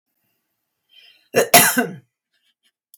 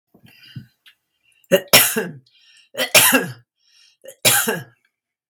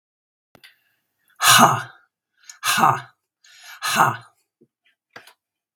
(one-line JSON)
{"cough_length": "3.0 s", "cough_amplitude": 32768, "cough_signal_mean_std_ratio": 0.29, "three_cough_length": "5.3 s", "three_cough_amplitude": 32768, "three_cough_signal_mean_std_ratio": 0.36, "exhalation_length": "5.8 s", "exhalation_amplitude": 32768, "exhalation_signal_mean_std_ratio": 0.32, "survey_phase": "beta (2021-08-13 to 2022-03-07)", "age": "65+", "gender": "Female", "wearing_mask": "No", "symptom_cough_any": true, "symptom_runny_or_blocked_nose": true, "symptom_headache": true, "symptom_other": true, "symptom_onset": "12 days", "smoker_status": "Ex-smoker", "respiratory_condition_asthma": false, "respiratory_condition_other": true, "recruitment_source": "REACT", "submission_delay": "0 days", "covid_test_result": "Negative", "covid_test_method": "RT-qPCR", "influenza_a_test_result": "Negative", "influenza_b_test_result": "Negative"}